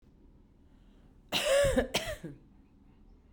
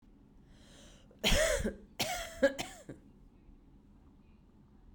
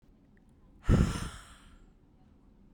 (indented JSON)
{
  "cough_length": "3.3 s",
  "cough_amplitude": 5311,
  "cough_signal_mean_std_ratio": 0.43,
  "three_cough_length": "4.9 s",
  "three_cough_amplitude": 6203,
  "three_cough_signal_mean_std_ratio": 0.39,
  "exhalation_length": "2.7 s",
  "exhalation_amplitude": 9327,
  "exhalation_signal_mean_std_ratio": 0.31,
  "survey_phase": "beta (2021-08-13 to 2022-03-07)",
  "age": "18-44",
  "gender": "Female",
  "wearing_mask": "No",
  "symptom_cough_any": true,
  "symptom_sore_throat": true,
  "symptom_headache": true,
  "symptom_onset": "3 days",
  "smoker_status": "Ex-smoker",
  "respiratory_condition_asthma": false,
  "respiratory_condition_other": false,
  "recruitment_source": "REACT",
  "submission_delay": "2 days",
  "covid_test_result": "Negative",
  "covid_test_method": "RT-qPCR",
  "influenza_a_test_result": "Unknown/Void",
  "influenza_b_test_result": "Unknown/Void"
}